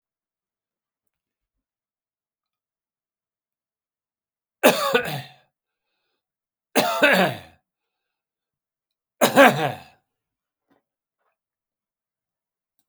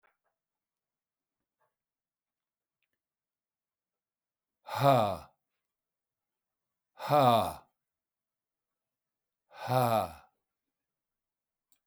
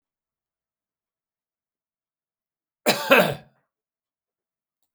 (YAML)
three_cough_length: 12.9 s
three_cough_amplitude: 32361
three_cough_signal_mean_std_ratio: 0.24
exhalation_length: 11.9 s
exhalation_amplitude: 8657
exhalation_signal_mean_std_ratio: 0.25
cough_length: 4.9 s
cough_amplitude: 27120
cough_signal_mean_std_ratio: 0.2
survey_phase: beta (2021-08-13 to 2022-03-07)
age: 65+
gender: Male
wearing_mask: 'No'
symptom_none: true
smoker_status: Never smoked
respiratory_condition_asthma: false
respiratory_condition_other: false
recruitment_source: REACT
submission_delay: 2 days
covid_test_result: Negative
covid_test_method: RT-qPCR
influenza_a_test_result: Negative
influenza_b_test_result: Negative